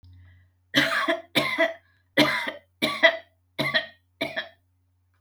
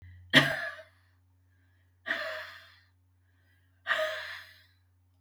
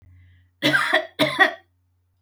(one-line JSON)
{"three_cough_length": "5.2 s", "three_cough_amplitude": 23212, "three_cough_signal_mean_std_ratio": 0.45, "exhalation_length": "5.2 s", "exhalation_amplitude": 20716, "exhalation_signal_mean_std_ratio": 0.32, "cough_length": "2.2 s", "cough_amplitude": 25113, "cough_signal_mean_std_ratio": 0.45, "survey_phase": "beta (2021-08-13 to 2022-03-07)", "age": "65+", "gender": "Female", "wearing_mask": "No", "symptom_none": true, "smoker_status": "Never smoked", "respiratory_condition_asthma": false, "respiratory_condition_other": false, "recruitment_source": "REACT", "submission_delay": "2 days", "covid_test_result": "Negative", "covid_test_method": "RT-qPCR", "influenza_a_test_result": "Negative", "influenza_b_test_result": "Negative"}